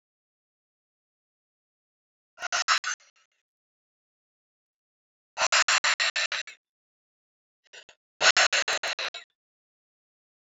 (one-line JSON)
{"exhalation_length": "10.4 s", "exhalation_amplitude": 19278, "exhalation_signal_mean_std_ratio": 0.3, "survey_phase": "beta (2021-08-13 to 2022-03-07)", "age": "45-64", "gender": "Female", "wearing_mask": "No", "symptom_cough_any": true, "symptom_runny_or_blocked_nose": true, "symptom_shortness_of_breath": true, "symptom_sore_throat": true, "symptom_abdominal_pain": true, "symptom_diarrhoea": true, "symptom_headache": true, "symptom_onset": "3 days", "smoker_status": "Never smoked", "respiratory_condition_asthma": false, "respiratory_condition_other": false, "recruitment_source": "Test and Trace", "submission_delay": "2 days", "covid_test_result": "Positive", "covid_test_method": "RT-qPCR", "covid_ct_value": 16.5, "covid_ct_gene": "ORF1ab gene", "covid_ct_mean": 16.9, "covid_viral_load": "2900000 copies/ml", "covid_viral_load_category": "High viral load (>1M copies/ml)"}